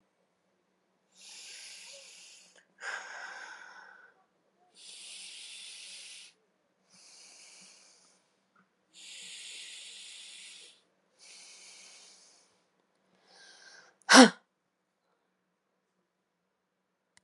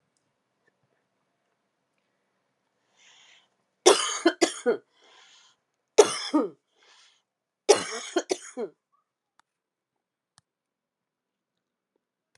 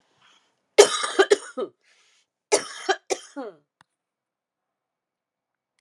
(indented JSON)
{
  "exhalation_length": "17.2 s",
  "exhalation_amplitude": 26028,
  "exhalation_signal_mean_std_ratio": 0.16,
  "three_cough_length": "12.4 s",
  "three_cough_amplitude": 26153,
  "three_cough_signal_mean_std_ratio": 0.22,
  "cough_length": "5.8 s",
  "cough_amplitude": 32287,
  "cough_signal_mean_std_ratio": 0.24,
  "survey_phase": "alpha (2021-03-01 to 2021-08-12)",
  "age": "45-64",
  "gender": "Female",
  "wearing_mask": "Yes",
  "symptom_cough_any": true,
  "symptom_new_continuous_cough": true,
  "symptom_fatigue": true,
  "symptom_fever_high_temperature": true,
  "symptom_headache": true,
  "symptom_change_to_sense_of_smell_or_taste": true,
  "symptom_loss_of_taste": true,
  "symptom_onset": "3 days",
  "smoker_status": "Never smoked",
  "respiratory_condition_asthma": false,
  "respiratory_condition_other": true,
  "recruitment_source": "Test and Trace",
  "submission_delay": "2 days",
  "covid_test_result": "Positive",
  "covid_test_method": "RT-qPCR",
  "covid_ct_value": 16.9,
  "covid_ct_gene": "ORF1ab gene",
  "covid_ct_mean": 17.6,
  "covid_viral_load": "1700000 copies/ml",
  "covid_viral_load_category": "High viral load (>1M copies/ml)"
}